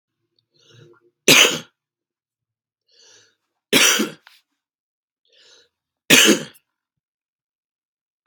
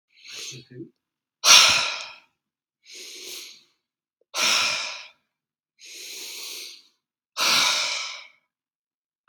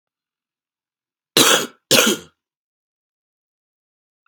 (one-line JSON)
{"three_cough_length": "8.3 s", "three_cough_amplitude": 32768, "three_cough_signal_mean_std_ratio": 0.26, "exhalation_length": "9.3 s", "exhalation_amplitude": 32768, "exhalation_signal_mean_std_ratio": 0.36, "cough_length": "4.3 s", "cough_amplitude": 32768, "cough_signal_mean_std_ratio": 0.27, "survey_phase": "beta (2021-08-13 to 2022-03-07)", "age": "18-44", "gender": "Male", "wearing_mask": "No", "symptom_cough_any": true, "symptom_onset": "12 days", "smoker_status": "Never smoked", "respiratory_condition_asthma": true, "respiratory_condition_other": false, "recruitment_source": "REACT", "submission_delay": "2 days", "covid_test_result": "Negative", "covid_test_method": "RT-qPCR"}